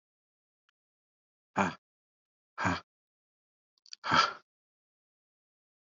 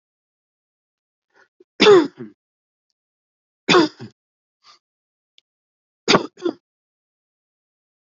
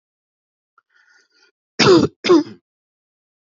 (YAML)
exhalation_length: 5.8 s
exhalation_amplitude: 8614
exhalation_signal_mean_std_ratio: 0.24
three_cough_length: 8.2 s
three_cough_amplitude: 32767
three_cough_signal_mean_std_ratio: 0.22
cough_length: 3.5 s
cough_amplitude: 29694
cough_signal_mean_std_ratio: 0.3
survey_phase: beta (2021-08-13 to 2022-03-07)
age: 45-64
gender: Male
wearing_mask: 'No'
symptom_none: true
symptom_onset: 9 days
smoker_status: Never smoked
respiratory_condition_asthma: false
respiratory_condition_other: false
recruitment_source: REACT
submission_delay: 1 day
covid_test_result: Positive
covid_test_method: RT-qPCR
covid_ct_value: 28.0
covid_ct_gene: N gene
influenza_a_test_result: Unknown/Void
influenza_b_test_result: Unknown/Void